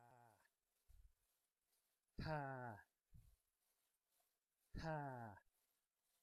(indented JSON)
{
  "exhalation_length": "6.2 s",
  "exhalation_amplitude": 496,
  "exhalation_signal_mean_std_ratio": 0.39,
  "survey_phase": "alpha (2021-03-01 to 2021-08-12)",
  "age": "18-44",
  "gender": "Male",
  "wearing_mask": "No",
  "symptom_none": true,
  "smoker_status": "Never smoked",
  "respiratory_condition_asthma": false,
  "respiratory_condition_other": false,
  "recruitment_source": "REACT",
  "submission_delay": "2 days",
  "covid_test_result": "Negative",
  "covid_test_method": "RT-qPCR"
}